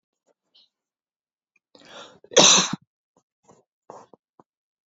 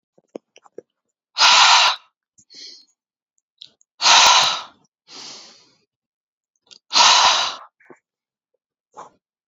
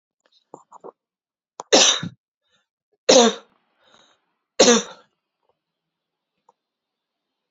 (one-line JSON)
{"cough_length": "4.9 s", "cough_amplitude": 28853, "cough_signal_mean_std_ratio": 0.21, "exhalation_length": "9.5 s", "exhalation_amplitude": 32767, "exhalation_signal_mean_std_ratio": 0.35, "three_cough_length": "7.5 s", "three_cough_amplitude": 31994, "three_cough_signal_mean_std_ratio": 0.25, "survey_phase": "beta (2021-08-13 to 2022-03-07)", "age": "18-44", "gender": "Female", "wearing_mask": "No", "symptom_headache": true, "symptom_onset": "12 days", "smoker_status": "Ex-smoker", "respiratory_condition_asthma": false, "respiratory_condition_other": false, "recruitment_source": "REACT", "submission_delay": "3 days", "covid_test_result": "Negative", "covid_test_method": "RT-qPCR", "influenza_a_test_result": "Negative", "influenza_b_test_result": "Positive", "influenza_b_ct_value": 35.8}